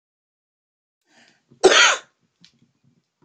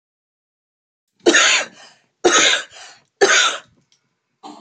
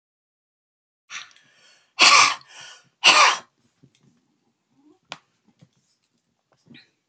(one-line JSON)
{"cough_length": "3.2 s", "cough_amplitude": 28567, "cough_signal_mean_std_ratio": 0.25, "three_cough_length": "4.6 s", "three_cough_amplitude": 30282, "three_cough_signal_mean_std_ratio": 0.41, "exhalation_length": "7.1 s", "exhalation_amplitude": 28696, "exhalation_signal_mean_std_ratio": 0.25, "survey_phase": "beta (2021-08-13 to 2022-03-07)", "age": "45-64", "gender": "Female", "wearing_mask": "No", "symptom_none": true, "smoker_status": "Current smoker (11 or more cigarettes per day)", "respiratory_condition_asthma": false, "respiratory_condition_other": false, "recruitment_source": "REACT", "submission_delay": "1 day", "covid_test_result": "Negative", "covid_test_method": "RT-qPCR"}